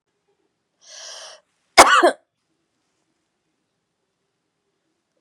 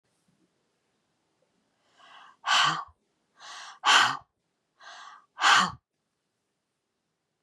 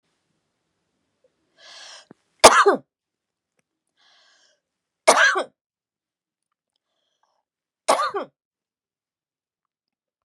{
  "cough_length": "5.2 s",
  "cough_amplitude": 32768,
  "cough_signal_mean_std_ratio": 0.2,
  "exhalation_length": "7.4 s",
  "exhalation_amplitude": 15663,
  "exhalation_signal_mean_std_ratio": 0.29,
  "three_cough_length": "10.2 s",
  "three_cough_amplitude": 32768,
  "three_cough_signal_mean_std_ratio": 0.21,
  "survey_phase": "beta (2021-08-13 to 2022-03-07)",
  "age": "65+",
  "gender": "Female",
  "wearing_mask": "No",
  "symptom_none": true,
  "smoker_status": "Never smoked",
  "respiratory_condition_asthma": false,
  "respiratory_condition_other": false,
  "recruitment_source": "REACT",
  "submission_delay": "1 day",
  "covid_test_result": "Negative",
  "covid_test_method": "RT-qPCR",
  "influenza_a_test_result": "Negative",
  "influenza_b_test_result": "Negative"
}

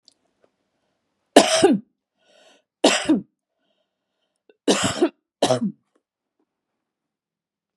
{
  "three_cough_length": "7.8 s",
  "three_cough_amplitude": 32768,
  "three_cough_signal_mean_std_ratio": 0.3,
  "survey_phase": "beta (2021-08-13 to 2022-03-07)",
  "age": "45-64",
  "gender": "Female",
  "wearing_mask": "No",
  "symptom_none": true,
  "smoker_status": "Never smoked",
  "respiratory_condition_asthma": false,
  "respiratory_condition_other": false,
  "recruitment_source": "REACT",
  "submission_delay": "1 day",
  "covid_test_result": "Negative",
  "covid_test_method": "RT-qPCR",
  "influenza_a_test_result": "Negative",
  "influenza_b_test_result": "Negative"
}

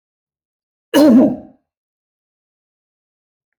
{
  "cough_length": "3.6 s",
  "cough_amplitude": 26138,
  "cough_signal_mean_std_ratio": 0.29,
  "survey_phase": "alpha (2021-03-01 to 2021-08-12)",
  "age": "45-64",
  "gender": "Male",
  "wearing_mask": "No",
  "symptom_none": true,
  "smoker_status": "Never smoked",
  "respiratory_condition_asthma": false,
  "respiratory_condition_other": false,
  "recruitment_source": "REACT",
  "submission_delay": "1 day",
  "covid_test_result": "Negative",
  "covid_test_method": "RT-qPCR"
}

